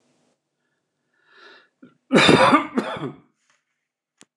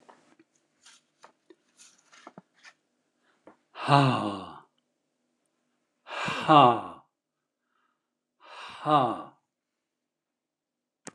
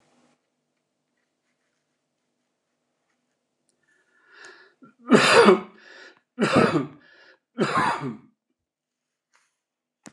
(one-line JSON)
{"cough_length": "4.4 s", "cough_amplitude": 29201, "cough_signal_mean_std_ratio": 0.32, "exhalation_length": "11.1 s", "exhalation_amplitude": 20688, "exhalation_signal_mean_std_ratio": 0.25, "three_cough_length": "10.1 s", "three_cough_amplitude": 28384, "three_cough_signal_mean_std_ratio": 0.28, "survey_phase": "beta (2021-08-13 to 2022-03-07)", "age": "65+", "gender": "Male", "wearing_mask": "No", "symptom_none": true, "smoker_status": "Never smoked", "respiratory_condition_asthma": false, "respiratory_condition_other": false, "recruitment_source": "REACT", "submission_delay": "2 days", "covid_test_result": "Negative", "covid_test_method": "RT-qPCR"}